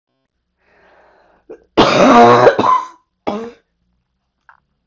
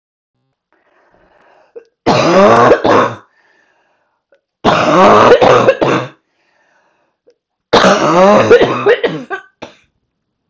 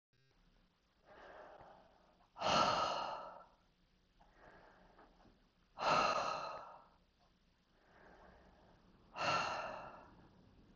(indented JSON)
{
  "cough_length": "4.9 s",
  "cough_amplitude": 32768,
  "cough_signal_mean_std_ratio": 0.4,
  "three_cough_length": "10.5 s",
  "three_cough_amplitude": 32768,
  "three_cough_signal_mean_std_ratio": 0.52,
  "exhalation_length": "10.8 s",
  "exhalation_amplitude": 3303,
  "exhalation_signal_mean_std_ratio": 0.41,
  "survey_phase": "beta (2021-08-13 to 2022-03-07)",
  "age": "45-64",
  "gender": "Female",
  "wearing_mask": "No",
  "symptom_cough_any": true,
  "symptom_new_continuous_cough": true,
  "symptom_runny_or_blocked_nose": true,
  "symptom_shortness_of_breath": true,
  "symptom_fatigue": true,
  "symptom_fever_high_temperature": true,
  "symptom_headache": true,
  "symptom_change_to_sense_of_smell_or_taste": true,
  "symptom_loss_of_taste": true,
  "symptom_onset": "8 days",
  "smoker_status": "Never smoked",
  "respiratory_condition_asthma": false,
  "respiratory_condition_other": false,
  "recruitment_source": "Test and Trace",
  "submission_delay": "1 day",
  "covid_test_result": "Positive",
  "covid_test_method": "RT-qPCR",
  "covid_ct_value": 21.4,
  "covid_ct_gene": "ORF1ab gene"
}